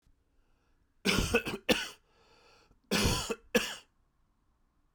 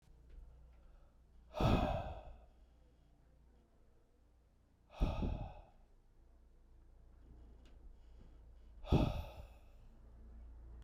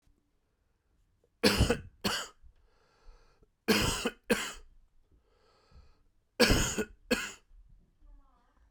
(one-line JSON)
{"cough_length": "4.9 s", "cough_amplitude": 8495, "cough_signal_mean_std_ratio": 0.38, "exhalation_length": "10.8 s", "exhalation_amplitude": 4364, "exhalation_signal_mean_std_ratio": 0.38, "three_cough_length": "8.7 s", "three_cough_amplitude": 13012, "three_cough_signal_mean_std_ratio": 0.35, "survey_phase": "alpha (2021-03-01 to 2021-08-12)", "age": "45-64", "gender": "Male", "wearing_mask": "No", "symptom_cough_any": true, "symptom_headache": true, "symptom_change_to_sense_of_smell_or_taste": true, "symptom_loss_of_taste": true, "symptom_onset": "4 days", "smoker_status": "Never smoked", "respiratory_condition_asthma": false, "respiratory_condition_other": false, "recruitment_source": "Test and Trace", "submission_delay": "3 days", "covid_test_result": "Positive", "covid_test_method": "RT-qPCR", "covid_ct_value": 15.7, "covid_ct_gene": "ORF1ab gene", "covid_ct_mean": 16.9, "covid_viral_load": "3000000 copies/ml", "covid_viral_load_category": "High viral load (>1M copies/ml)"}